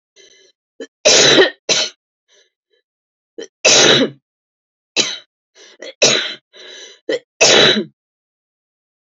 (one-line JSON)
{"three_cough_length": "9.1 s", "three_cough_amplitude": 32768, "three_cough_signal_mean_std_ratio": 0.39, "survey_phase": "beta (2021-08-13 to 2022-03-07)", "age": "45-64", "gender": "Female", "wearing_mask": "No", "symptom_cough_any": true, "symptom_runny_or_blocked_nose": true, "symptom_diarrhoea": true, "symptom_onset": "12 days", "smoker_status": "Never smoked", "respiratory_condition_asthma": true, "respiratory_condition_other": false, "recruitment_source": "REACT", "submission_delay": "2 days", "covid_test_result": "Negative", "covid_test_method": "RT-qPCR"}